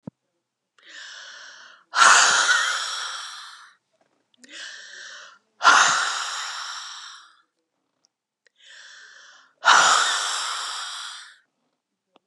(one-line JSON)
{"exhalation_length": "12.3 s", "exhalation_amplitude": 29075, "exhalation_signal_mean_std_ratio": 0.41, "survey_phase": "beta (2021-08-13 to 2022-03-07)", "age": "65+", "gender": "Female", "wearing_mask": "No", "symptom_cough_any": true, "symptom_runny_or_blocked_nose": true, "symptom_change_to_sense_of_smell_or_taste": true, "symptom_onset": "5 days", "smoker_status": "Never smoked", "respiratory_condition_asthma": false, "respiratory_condition_other": false, "recruitment_source": "Test and Trace", "submission_delay": "3 days", "covid_test_result": "Positive", "covid_test_method": "RT-qPCR", "covid_ct_value": 14.8, "covid_ct_gene": "N gene", "covid_ct_mean": 16.5, "covid_viral_load": "3800000 copies/ml", "covid_viral_load_category": "High viral load (>1M copies/ml)"}